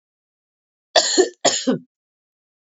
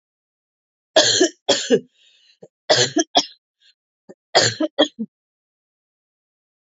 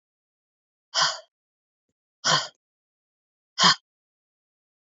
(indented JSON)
{
  "cough_length": "2.6 s",
  "cough_amplitude": 28377,
  "cough_signal_mean_std_ratio": 0.35,
  "three_cough_length": "6.7 s",
  "three_cough_amplitude": 32614,
  "three_cough_signal_mean_std_ratio": 0.34,
  "exhalation_length": "4.9 s",
  "exhalation_amplitude": 22354,
  "exhalation_signal_mean_std_ratio": 0.25,
  "survey_phase": "beta (2021-08-13 to 2022-03-07)",
  "age": "45-64",
  "gender": "Female",
  "wearing_mask": "No",
  "symptom_cough_any": true,
  "symptom_runny_or_blocked_nose": true,
  "symptom_shortness_of_breath": true,
  "symptom_fatigue": true,
  "symptom_headache": true,
  "smoker_status": "Never smoked",
  "respiratory_condition_asthma": false,
  "respiratory_condition_other": false,
  "recruitment_source": "Test and Trace",
  "submission_delay": "3 days",
  "covid_test_result": "Positive",
  "covid_test_method": "RT-qPCR"
}